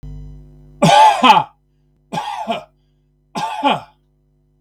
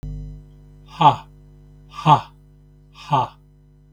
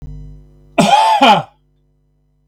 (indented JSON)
{
  "three_cough_length": "4.6 s",
  "three_cough_amplitude": 32768,
  "three_cough_signal_mean_std_ratio": 0.42,
  "exhalation_length": "3.9 s",
  "exhalation_amplitude": 32768,
  "exhalation_signal_mean_std_ratio": 0.33,
  "cough_length": "2.5 s",
  "cough_amplitude": 32768,
  "cough_signal_mean_std_ratio": 0.47,
  "survey_phase": "beta (2021-08-13 to 2022-03-07)",
  "age": "65+",
  "gender": "Male",
  "wearing_mask": "No",
  "symptom_none": true,
  "smoker_status": "Never smoked",
  "respiratory_condition_asthma": false,
  "respiratory_condition_other": false,
  "recruitment_source": "REACT",
  "submission_delay": "1 day",
  "covid_test_result": "Negative",
  "covid_test_method": "RT-qPCR"
}